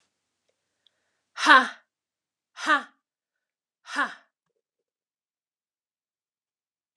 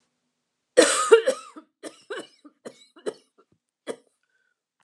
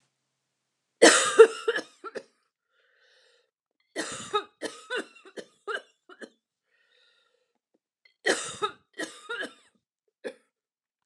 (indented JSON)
{
  "exhalation_length": "7.0 s",
  "exhalation_amplitude": 31195,
  "exhalation_signal_mean_std_ratio": 0.19,
  "cough_length": "4.8 s",
  "cough_amplitude": 25822,
  "cough_signal_mean_std_ratio": 0.26,
  "three_cough_length": "11.1 s",
  "three_cough_amplitude": 26961,
  "three_cough_signal_mean_std_ratio": 0.23,
  "survey_phase": "beta (2021-08-13 to 2022-03-07)",
  "age": "45-64",
  "gender": "Female",
  "wearing_mask": "No",
  "symptom_cough_any": true,
  "symptom_new_continuous_cough": true,
  "symptom_runny_or_blocked_nose": true,
  "symptom_headache": true,
  "symptom_change_to_sense_of_smell_or_taste": true,
  "symptom_loss_of_taste": true,
  "smoker_status": "Ex-smoker",
  "respiratory_condition_asthma": false,
  "respiratory_condition_other": false,
  "recruitment_source": "Test and Trace",
  "submission_delay": "2 days",
  "covid_test_result": "Positive",
  "covid_test_method": "RT-qPCR",
  "covid_ct_value": 20.3,
  "covid_ct_gene": "ORF1ab gene"
}